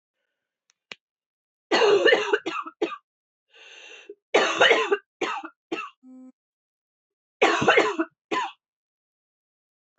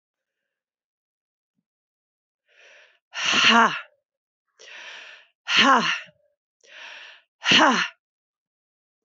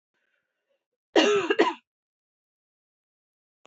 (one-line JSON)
{"three_cough_length": "10.0 s", "three_cough_amplitude": 19454, "three_cough_signal_mean_std_ratio": 0.39, "exhalation_length": "9.0 s", "exhalation_amplitude": 24353, "exhalation_signal_mean_std_ratio": 0.33, "cough_length": "3.7 s", "cough_amplitude": 16099, "cough_signal_mean_std_ratio": 0.29, "survey_phase": "beta (2021-08-13 to 2022-03-07)", "age": "45-64", "gender": "Female", "wearing_mask": "No", "symptom_cough_any": true, "symptom_new_continuous_cough": true, "symptom_runny_or_blocked_nose": true, "symptom_shortness_of_breath": true, "symptom_fatigue": true, "symptom_change_to_sense_of_smell_or_taste": true, "symptom_loss_of_taste": true, "smoker_status": "Never smoked", "respiratory_condition_asthma": false, "respiratory_condition_other": false, "recruitment_source": "Test and Trace", "submission_delay": "1 day", "covid_test_result": "Positive", "covid_test_method": "LFT"}